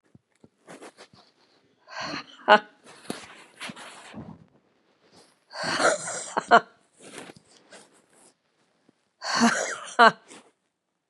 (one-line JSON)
{"exhalation_length": "11.1 s", "exhalation_amplitude": 31672, "exhalation_signal_mean_std_ratio": 0.27, "survey_phase": "beta (2021-08-13 to 2022-03-07)", "age": "45-64", "gender": "Female", "wearing_mask": "No", "symptom_cough_any": true, "symptom_runny_or_blocked_nose": true, "symptom_sore_throat": true, "symptom_fatigue": true, "symptom_headache": true, "symptom_onset": "7 days", "smoker_status": "Never smoked", "respiratory_condition_asthma": false, "respiratory_condition_other": false, "recruitment_source": "Test and Trace", "submission_delay": "2 days", "covid_test_result": "Positive", "covid_test_method": "RT-qPCR", "covid_ct_value": 30.6, "covid_ct_gene": "ORF1ab gene", "covid_ct_mean": 31.3, "covid_viral_load": "54 copies/ml", "covid_viral_load_category": "Minimal viral load (< 10K copies/ml)"}